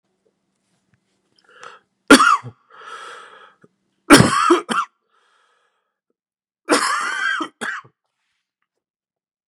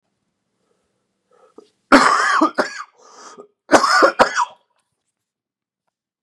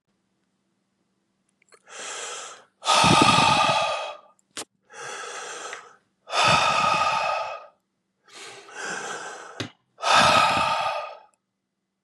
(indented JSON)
{
  "three_cough_length": "9.5 s",
  "three_cough_amplitude": 32768,
  "three_cough_signal_mean_std_ratio": 0.3,
  "cough_length": "6.2 s",
  "cough_amplitude": 32768,
  "cough_signal_mean_std_ratio": 0.35,
  "exhalation_length": "12.0 s",
  "exhalation_amplitude": 22633,
  "exhalation_signal_mean_std_ratio": 0.51,
  "survey_phase": "beta (2021-08-13 to 2022-03-07)",
  "age": "18-44",
  "gender": "Male",
  "wearing_mask": "No",
  "symptom_runny_or_blocked_nose": true,
  "symptom_fever_high_temperature": true,
  "symptom_onset": "2 days",
  "smoker_status": "Never smoked",
  "respiratory_condition_asthma": false,
  "respiratory_condition_other": false,
  "recruitment_source": "Test and Trace",
  "submission_delay": "1 day",
  "covid_test_result": "Positive",
  "covid_test_method": "ePCR"
}